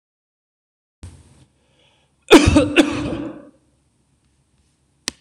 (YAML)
cough_length: 5.2 s
cough_amplitude: 26028
cough_signal_mean_std_ratio: 0.28
survey_phase: beta (2021-08-13 to 2022-03-07)
age: 45-64
gender: Male
wearing_mask: 'No'
symptom_runny_or_blocked_nose: true
symptom_onset: 13 days
smoker_status: Never smoked
respiratory_condition_asthma: false
respiratory_condition_other: false
recruitment_source: REACT
submission_delay: 1 day
covid_test_result: Negative
covid_test_method: RT-qPCR
influenza_a_test_result: Unknown/Void
influenza_b_test_result: Unknown/Void